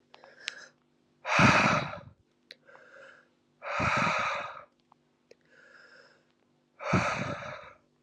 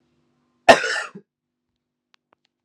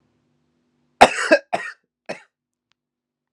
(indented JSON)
{
  "exhalation_length": "8.0 s",
  "exhalation_amplitude": 13119,
  "exhalation_signal_mean_std_ratio": 0.41,
  "three_cough_length": "2.6 s",
  "three_cough_amplitude": 32768,
  "three_cough_signal_mean_std_ratio": 0.2,
  "cough_length": "3.3 s",
  "cough_amplitude": 32768,
  "cough_signal_mean_std_ratio": 0.22,
  "survey_phase": "alpha (2021-03-01 to 2021-08-12)",
  "age": "18-44",
  "gender": "Male",
  "wearing_mask": "No",
  "symptom_cough_any": true,
  "symptom_change_to_sense_of_smell_or_taste": true,
  "smoker_status": "Never smoked",
  "respiratory_condition_asthma": false,
  "respiratory_condition_other": false,
  "recruitment_source": "Test and Trace",
  "submission_delay": "0 days",
  "covid_test_result": "Positive",
  "covid_test_method": "LFT"
}